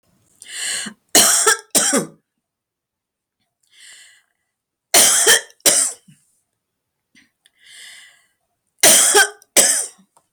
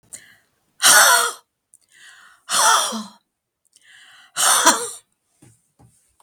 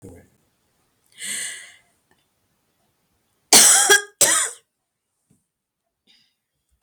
{"three_cough_length": "10.3 s", "three_cough_amplitude": 32768, "three_cough_signal_mean_std_ratio": 0.38, "exhalation_length": "6.2 s", "exhalation_amplitude": 32768, "exhalation_signal_mean_std_ratio": 0.39, "cough_length": "6.8 s", "cough_amplitude": 32768, "cough_signal_mean_std_ratio": 0.28, "survey_phase": "beta (2021-08-13 to 2022-03-07)", "age": "65+", "gender": "Female", "wearing_mask": "No", "symptom_cough_any": true, "symptom_fatigue": true, "symptom_onset": "12 days", "smoker_status": "Never smoked", "respiratory_condition_asthma": false, "respiratory_condition_other": false, "recruitment_source": "REACT", "submission_delay": "34 days", "covid_test_result": "Negative", "covid_test_method": "RT-qPCR", "influenza_a_test_result": "Negative", "influenza_b_test_result": "Negative"}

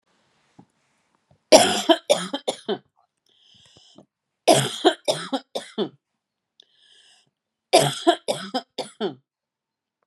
{"three_cough_length": "10.1 s", "three_cough_amplitude": 32767, "three_cough_signal_mean_std_ratio": 0.31, "survey_phase": "beta (2021-08-13 to 2022-03-07)", "age": "45-64", "gender": "Female", "wearing_mask": "No", "symptom_cough_any": true, "symptom_runny_or_blocked_nose": true, "symptom_sore_throat": true, "symptom_fatigue": true, "symptom_headache": true, "symptom_onset": "7 days", "smoker_status": "Never smoked", "respiratory_condition_asthma": false, "respiratory_condition_other": false, "recruitment_source": "Test and Trace", "submission_delay": "1 day", "covid_test_result": "Negative", "covid_test_method": "RT-qPCR"}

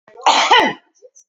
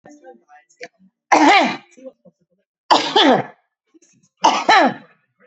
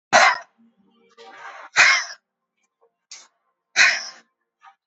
{"cough_length": "1.3 s", "cough_amplitude": 30871, "cough_signal_mean_std_ratio": 0.52, "three_cough_length": "5.5 s", "three_cough_amplitude": 30396, "three_cough_signal_mean_std_ratio": 0.41, "exhalation_length": "4.9 s", "exhalation_amplitude": 28370, "exhalation_signal_mean_std_ratio": 0.32, "survey_phase": "alpha (2021-03-01 to 2021-08-12)", "age": "45-64", "gender": "Female", "wearing_mask": "Yes", "symptom_none": true, "smoker_status": "Prefer not to say", "respiratory_condition_asthma": false, "respiratory_condition_other": false, "recruitment_source": "REACT", "submission_delay": "1 day", "covid_test_result": "Negative", "covid_test_method": "RT-qPCR"}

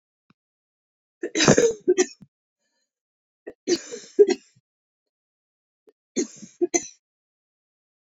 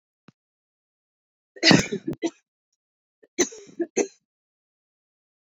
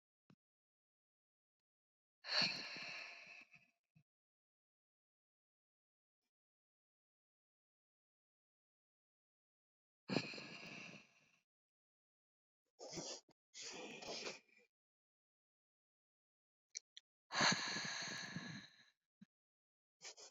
{"three_cough_length": "8.0 s", "three_cough_amplitude": 27728, "three_cough_signal_mean_std_ratio": 0.27, "cough_length": "5.5 s", "cough_amplitude": 26785, "cough_signal_mean_std_ratio": 0.24, "exhalation_length": "20.3 s", "exhalation_amplitude": 2764, "exhalation_signal_mean_std_ratio": 0.29, "survey_phase": "beta (2021-08-13 to 2022-03-07)", "age": "18-44", "gender": "Female", "wearing_mask": "No", "symptom_cough_any": true, "symptom_new_continuous_cough": true, "symptom_change_to_sense_of_smell_or_taste": true, "symptom_onset": "4 days", "smoker_status": "Never smoked", "respiratory_condition_asthma": false, "respiratory_condition_other": false, "recruitment_source": "Test and Trace", "submission_delay": "2 days", "covid_test_result": "Positive", "covid_test_method": "RT-qPCR"}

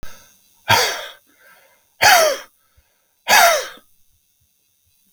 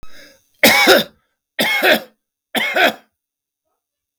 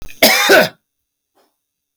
{"exhalation_length": "5.1 s", "exhalation_amplitude": 32768, "exhalation_signal_mean_std_ratio": 0.37, "three_cough_length": "4.2 s", "three_cough_amplitude": 32768, "three_cough_signal_mean_std_ratio": 0.44, "cough_length": "2.0 s", "cough_amplitude": 32768, "cough_signal_mean_std_ratio": 0.42, "survey_phase": "beta (2021-08-13 to 2022-03-07)", "age": "45-64", "gender": "Male", "wearing_mask": "No", "symptom_none": true, "smoker_status": "Never smoked", "respiratory_condition_asthma": false, "respiratory_condition_other": false, "recruitment_source": "Test and Trace", "submission_delay": "0 days", "covid_test_result": "Negative", "covid_test_method": "LFT"}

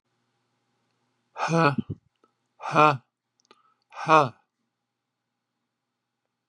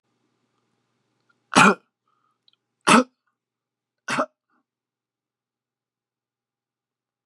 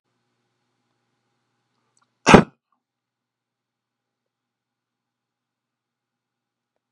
{"exhalation_length": "6.5 s", "exhalation_amplitude": 22688, "exhalation_signal_mean_std_ratio": 0.25, "three_cough_length": "7.3 s", "three_cough_amplitude": 30825, "three_cough_signal_mean_std_ratio": 0.19, "cough_length": "6.9 s", "cough_amplitude": 32768, "cough_signal_mean_std_ratio": 0.11, "survey_phase": "beta (2021-08-13 to 2022-03-07)", "age": "65+", "gender": "Male", "wearing_mask": "No", "symptom_none": true, "smoker_status": "Never smoked", "respiratory_condition_asthma": false, "respiratory_condition_other": false, "recruitment_source": "REACT", "submission_delay": "3 days", "covid_test_result": "Negative", "covid_test_method": "RT-qPCR", "influenza_a_test_result": "Negative", "influenza_b_test_result": "Negative"}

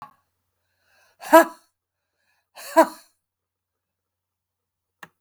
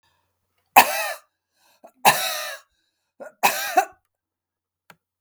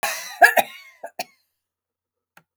{"exhalation_length": "5.2 s", "exhalation_amplitude": 32766, "exhalation_signal_mean_std_ratio": 0.17, "three_cough_length": "5.2 s", "three_cough_amplitude": 32768, "three_cough_signal_mean_std_ratio": 0.29, "cough_length": "2.6 s", "cough_amplitude": 28478, "cough_signal_mean_std_ratio": 0.26, "survey_phase": "beta (2021-08-13 to 2022-03-07)", "age": "65+", "gender": "Female", "wearing_mask": "No", "symptom_none": true, "smoker_status": "Ex-smoker", "respiratory_condition_asthma": false, "respiratory_condition_other": false, "recruitment_source": "REACT", "submission_delay": "3 days", "covid_test_result": "Negative", "covid_test_method": "RT-qPCR", "influenza_a_test_result": "Negative", "influenza_b_test_result": "Negative"}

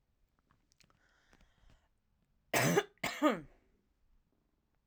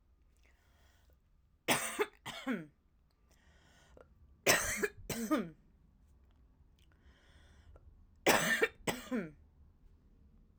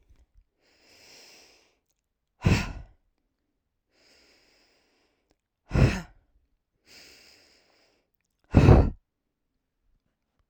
{"cough_length": "4.9 s", "cough_amplitude": 5704, "cough_signal_mean_std_ratio": 0.28, "three_cough_length": "10.6 s", "three_cough_amplitude": 6870, "three_cough_signal_mean_std_ratio": 0.35, "exhalation_length": "10.5 s", "exhalation_amplitude": 24337, "exhalation_signal_mean_std_ratio": 0.22, "survey_phase": "alpha (2021-03-01 to 2021-08-12)", "age": "18-44", "gender": "Female", "wearing_mask": "No", "symptom_none": true, "smoker_status": "Never smoked", "respiratory_condition_asthma": false, "respiratory_condition_other": false, "recruitment_source": "REACT", "submission_delay": "1 day", "covid_test_result": "Negative", "covid_test_method": "RT-qPCR"}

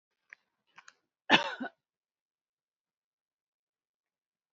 {"cough_length": "4.5 s", "cough_amplitude": 14426, "cough_signal_mean_std_ratio": 0.16, "survey_phase": "beta (2021-08-13 to 2022-03-07)", "age": "18-44", "gender": "Female", "wearing_mask": "No", "symptom_none": true, "smoker_status": "Never smoked", "respiratory_condition_asthma": true, "respiratory_condition_other": false, "recruitment_source": "REACT", "submission_delay": "3 days", "covid_test_result": "Negative", "covid_test_method": "RT-qPCR"}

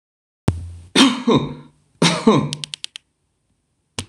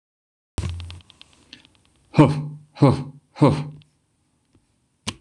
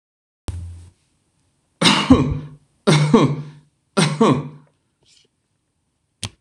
{"cough_length": "4.1 s", "cough_amplitude": 26028, "cough_signal_mean_std_ratio": 0.41, "exhalation_length": "5.2 s", "exhalation_amplitude": 26027, "exhalation_signal_mean_std_ratio": 0.31, "three_cough_length": "6.4 s", "three_cough_amplitude": 26028, "three_cough_signal_mean_std_ratio": 0.4, "survey_phase": "beta (2021-08-13 to 2022-03-07)", "age": "45-64", "gender": "Male", "wearing_mask": "No", "symptom_other": true, "symptom_onset": "5 days", "smoker_status": "Never smoked", "respiratory_condition_asthma": false, "respiratory_condition_other": false, "recruitment_source": "REACT", "submission_delay": "6 days", "covid_test_result": "Negative", "covid_test_method": "RT-qPCR", "influenza_a_test_result": "Negative", "influenza_b_test_result": "Negative"}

